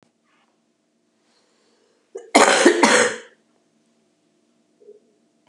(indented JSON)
{
  "cough_length": "5.5 s",
  "cough_amplitude": 32767,
  "cough_signal_mean_std_ratio": 0.3,
  "survey_phase": "beta (2021-08-13 to 2022-03-07)",
  "age": "65+",
  "gender": "Female",
  "wearing_mask": "No",
  "symptom_cough_any": true,
  "symptom_runny_or_blocked_nose": true,
  "smoker_status": "Never smoked",
  "respiratory_condition_asthma": false,
  "respiratory_condition_other": true,
  "recruitment_source": "REACT",
  "submission_delay": "1 day",
  "covid_test_result": "Negative",
  "covid_test_method": "RT-qPCR",
  "influenza_a_test_result": "Unknown/Void",
  "influenza_b_test_result": "Unknown/Void"
}